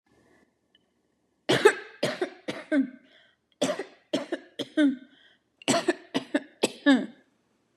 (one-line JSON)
{"three_cough_length": "7.8 s", "three_cough_amplitude": 20345, "three_cough_signal_mean_std_ratio": 0.37, "survey_phase": "beta (2021-08-13 to 2022-03-07)", "age": "45-64", "gender": "Female", "wearing_mask": "No", "symptom_cough_any": true, "symptom_headache": true, "symptom_onset": "1 day", "smoker_status": "Prefer not to say", "respiratory_condition_asthma": false, "respiratory_condition_other": false, "recruitment_source": "Test and Trace", "submission_delay": "1 day", "covid_test_result": "Positive", "covid_test_method": "RT-qPCR", "covid_ct_value": 22.1, "covid_ct_gene": "ORF1ab gene", "covid_ct_mean": 23.1, "covid_viral_load": "27000 copies/ml", "covid_viral_load_category": "Low viral load (10K-1M copies/ml)"}